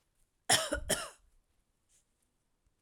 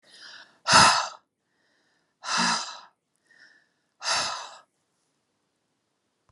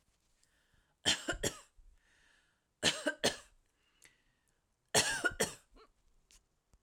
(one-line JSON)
{"cough_length": "2.8 s", "cough_amplitude": 6977, "cough_signal_mean_std_ratio": 0.3, "exhalation_length": "6.3 s", "exhalation_amplitude": 22460, "exhalation_signal_mean_std_ratio": 0.31, "three_cough_length": "6.8 s", "three_cough_amplitude": 7451, "three_cough_signal_mean_std_ratio": 0.31, "survey_phase": "alpha (2021-03-01 to 2021-08-12)", "age": "45-64", "gender": "Female", "wearing_mask": "No", "symptom_none": true, "smoker_status": "Never smoked", "respiratory_condition_asthma": false, "respiratory_condition_other": false, "recruitment_source": "REACT", "submission_delay": "1 day", "covid_test_result": "Negative", "covid_test_method": "RT-qPCR"}